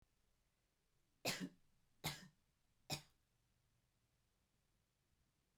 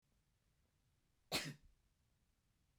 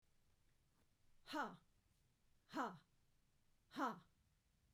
{"three_cough_length": "5.6 s", "three_cough_amplitude": 1233, "three_cough_signal_mean_std_ratio": 0.25, "cough_length": "2.8 s", "cough_amplitude": 1682, "cough_signal_mean_std_ratio": 0.24, "exhalation_length": "4.7 s", "exhalation_amplitude": 843, "exhalation_signal_mean_std_ratio": 0.34, "survey_phase": "beta (2021-08-13 to 2022-03-07)", "age": "45-64", "gender": "Female", "wearing_mask": "No", "symptom_runny_or_blocked_nose": true, "smoker_status": "Never smoked", "respiratory_condition_asthma": true, "respiratory_condition_other": false, "recruitment_source": "REACT", "submission_delay": "2 days", "covid_test_result": "Negative", "covid_test_method": "RT-qPCR"}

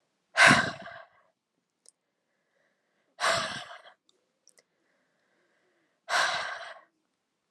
{"exhalation_length": "7.5 s", "exhalation_amplitude": 18267, "exhalation_signal_mean_std_ratio": 0.28, "survey_phase": "alpha (2021-03-01 to 2021-08-12)", "age": "18-44", "gender": "Female", "wearing_mask": "No", "symptom_cough_any": true, "symptom_headache": true, "smoker_status": "Never smoked", "respiratory_condition_asthma": false, "respiratory_condition_other": false, "recruitment_source": "Test and Trace", "submission_delay": "1 day", "covid_test_result": "Positive", "covid_test_method": "RT-qPCR"}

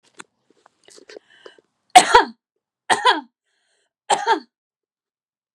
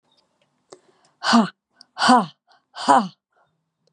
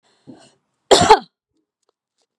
{"three_cough_length": "5.5 s", "three_cough_amplitude": 32768, "three_cough_signal_mean_std_ratio": 0.25, "exhalation_length": "3.9 s", "exhalation_amplitude": 30289, "exhalation_signal_mean_std_ratio": 0.33, "cough_length": "2.4 s", "cough_amplitude": 32768, "cough_signal_mean_std_ratio": 0.25, "survey_phase": "beta (2021-08-13 to 2022-03-07)", "age": "45-64", "gender": "Female", "wearing_mask": "No", "symptom_cough_any": true, "symptom_shortness_of_breath": true, "smoker_status": "Never smoked", "respiratory_condition_asthma": false, "respiratory_condition_other": false, "recruitment_source": "REACT", "submission_delay": "1 day", "covid_test_result": "Negative", "covid_test_method": "RT-qPCR", "influenza_a_test_result": "Negative", "influenza_b_test_result": "Negative"}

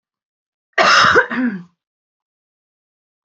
{"cough_length": "3.2 s", "cough_amplitude": 30555, "cough_signal_mean_std_ratio": 0.38, "survey_phase": "beta (2021-08-13 to 2022-03-07)", "age": "45-64", "gender": "Female", "wearing_mask": "No", "symptom_abdominal_pain": true, "symptom_headache": true, "smoker_status": "Ex-smoker", "respiratory_condition_asthma": false, "respiratory_condition_other": false, "recruitment_source": "Test and Trace", "submission_delay": "0 days", "covid_test_result": "Negative", "covid_test_method": "LFT"}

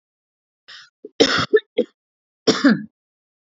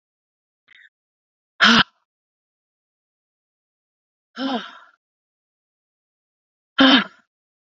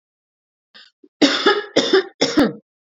{"cough_length": "3.4 s", "cough_amplitude": 32767, "cough_signal_mean_std_ratio": 0.33, "exhalation_length": "7.7 s", "exhalation_amplitude": 29926, "exhalation_signal_mean_std_ratio": 0.22, "three_cough_length": "3.0 s", "three_cough_amplitude": 31756, "three_cough_signal_mean_std_ratio": 0.44, "survey_phase": "beta (2021-08-13 to 2022-03-07)", "age": "18-44", "gender": "Female", "wearing_mask": "No", "symptom_cough_any": true, "symptom_runny_or_blocked_nose": true, "symptom_sore_throat": true, "symptom_fatigue": true, "symptom_headache": true, "symptom_onset": "2 days", "smoker_status": "Never smoked", "respiratory_condition_asthma": false, "respiratory_condition_other": false, "recruitment_source": "Test and Trace", "submission_delay": "2 days", "covid_test_result": "Positive", "covid_test_method": "RT-qPCR", "covid_ct_value": 33.3, "covid_ct_gene": "N gene"}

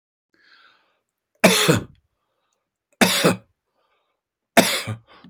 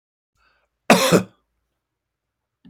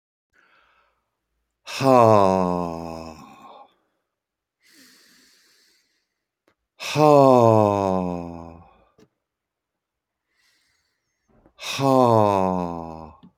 {"three_cough_length": "5.3 s", "three_cough_amplitude": 29119, "three_cough_signal_mean_std_ratio": 0.33, "cough_length": "2.7 s", "cough_amplitude": 32767, "cough_signal_mean_std_ratio": 0.26, "exhalation_length": "13.4 s", "exhalation_amplitude": 27748, "exhalation_signal_mean_std_ratio": 0.33, "survey_phase": "beta (2021-08-13 to 2022-03-07)", "age": "45-64", "gender": "Male", "wearing_mask": "No", "symptom_none": true, "smoker_status": "Ex-smoker", "respiratory_condition_asthma": false, "respiratory_condition_other": false, "recruitment_source": "REACT", "submission_delay": "2 days", "covid_test_result": "Negative", "covid_test_method": "RT-qPCR"}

